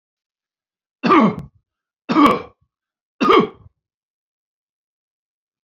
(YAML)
three_cough_length: 5.6 s
three_cough_amplitude: 32767
three_cough_signal_mean_std_ratio: 0.31
survey_phase: beta (2021-08-13 to 2022-03-07)
age: 45-64
gender: Male
wearing_mask: 'No'
symptom_none: true
smoker_status: Ex-smoker
respiratory_condition_asthma: false
respiratory_condition_other: false
recruitment_source: REACT
submission_delay: 3 days
covid_test_result: Negative
covid_test_method: RT-qPCR